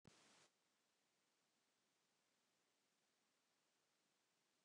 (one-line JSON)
{"cough_length": "4.6 s", "cough_amplitude": 78, "cough_signal_mean_std_ratio": 0.59, "survey_phase": "beta (2021-08-13 to 2022-03-07)", "age": "65+", "gender": "Male", "wearing_mask": "No", "symptom_none": true, "smoker_status": "Never smoked", "respiratory_condition_asthma": false, "respiratory_condition_other": false, "recruitment_source": "REACT", "submission_delay": "3 days", "covid_test_result": "Negative", "covid_test_method": "RT-qPCR"}